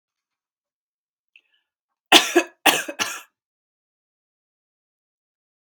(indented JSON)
{
  "three_cough_length": "5.7 s",
  "three_cough_amplitude": 32767,
  "three_cough_signal_mean_std_ratio": 0.21,
  "survey_phase": "beta (2021-08-13 to 2022-03-07)",
  "age": "18-44",
  "gender": "Female",
  "wearing_mask": "No",
  "symptom_none": true,
  "smoker_status": "Ex-smoker",
  "respiratory_condition_asthma": false,
  "respiratory_condition_other": false,
  "recruitment_source": "REACT",
  "submission_delay": "2 days",
  "covid_test_result": "Negative",
  "covid_test_method": "RT-qPCR"
}